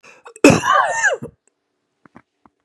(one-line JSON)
{"cough_length": "2.6 s", "cough_amplitude": 32768, "cough_signal_mean_std_ratio": 0.39, "survey_phase": "beta (2021-08-13 to 2022-03-07)", "age": "45-64", "gender": "Male", "wearing_mask": "No", "symptom_cough_any": true, "symptom_fever_high_temperature": true, "smoker_status": "Ex-smoker", "respiratory_condition_asthma": false, "respiratory_condition_other": false, "recruitment_source": "Test and Trace", "submission_delay": "1 day", "covid_test_result": "Negative", "covid_test_method": "RT-qPCR"}